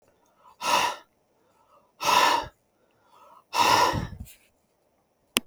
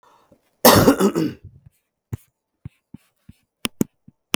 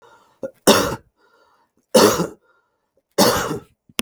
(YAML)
exhalation_length: 5.5 s
exhalation_amplitude: 32766
exhalation_signal_mean_std_ratio: 0.4
cough_length: 4.4 s
cough_amplitude: 32768
cough_signal_mean_std_ratio: 0.29
three_cough_length: 4.0 s
three_cough_amplitude: 32768
three_cough_signal_mean_std_ratio: 0.38
survey_phase: beta (2021-08-13 to 2022-03-07)
age: 45-64
gender: Male
wearing_mask: 'No'
symptom_none: true
smoker_status: Ex-smoker
respiratory_condition_asthma: false
respiratory_condition_other: false
recruitment_source: REACT
submission_delay: 2 days
covid_test_result: Negative
covid_test_method: RT-qPCR